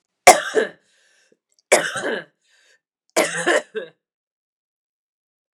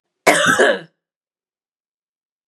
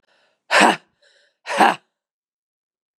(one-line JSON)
{"three_cough_length": "5.5 s", "three_cough_amplitude": 32768, "three_cough_signal_mean_std_ratio": 0.29, "cough_length": "2.5 s", "cough_amplitude": 32768, "cough_signal_mean_std_ratio": 0.36, "exhalation_length": "3.0 s", "exhalation_amplitude": 32268, "exhalation_signal_mean_std_ratio": 0.3, "survey_phase": "beta (2021-08-13 to 2022-03-07)", "age": "45-64", "gender": "Female", "wearing_mask": "No", "symptom_runny_or_blocked_nose": true, "symptom_shortness_of_breath": true, "symptom_fatigue": true, "symptom_fever_high_temperature": true, "symptom_headache": true, "symptom_change_to_sense_of_smell_or_taste": true, "symptom_onset": "3 days", "smoker_status": "Prefer not to say", "respiratory_condition_asthma": false, "respiratory_condition_other": false, "recruitment_source": "Test and Trace", "submission_delay": "2 days", "covid_test_result": "Positive", "covid_test_method": "RT-qPCR", "covid_ct_value": 13.1, "covid_ct_gene": "ORF1ab gene", "covid_ct_mean": 13.9, "covid_viral_load": "29000000 copies/ml", "covid_viral_load_category": "High viral load (>1M copies/ml)"}